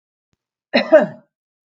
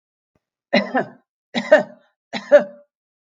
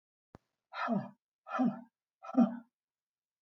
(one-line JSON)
{"cough_length": "1.7 s", "cough_amplitude": 32766, "cough_signal_mean_std_ratio": 0.29, "three_cough_length": "3.2 s", "three_cough_amplitude": 32766, "three_cough_signal_mean_std_ratio": 0.31, "exhalation_length": "3.4 s", "exhalation_amplitude": 5129, "exhalation_signal_mean_std_ratio": 0.35, "survey_phase": "beta (2021-08-13 to 2022-03-07)", "age": "65+", "gender": "Female", "wearing_mask": "No", "symptom_none": true, "smoker_status": "Never smoked", "respiratory_condition_asthma": false, "respiratory_condition_other": false, "recruitment_source": "REACT", "submission_delay": "6 days", "covid_test_result": "Negative", "covid_test_method": "RT-qPCR", "influenza_a_test_result": "Negative", "influenza_b_test_result": "Negative"}